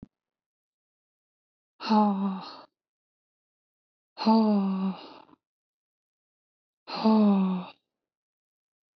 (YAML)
exhalation_length: 9.0 s
exhalation_amplitude: 11080
exhalation_signal_mean_std_ratio: 0.4
survey_phase: alpha (2021-03-01 to 2021-08-12)
age: 18-44
gender: Female
wearing_mask: 'No'
symptom_cough_any: true
symptom_new_continuous_cough: true
symptom_onset: 5 days
smoker_status: Never smoked
respiratory_condition_asthma: true
respiratory_condition_other: false
recruitment_source: Test and Trace
submission_delay: 2 days
covid_test_result: Positive
covid_test_method: RT-qPCR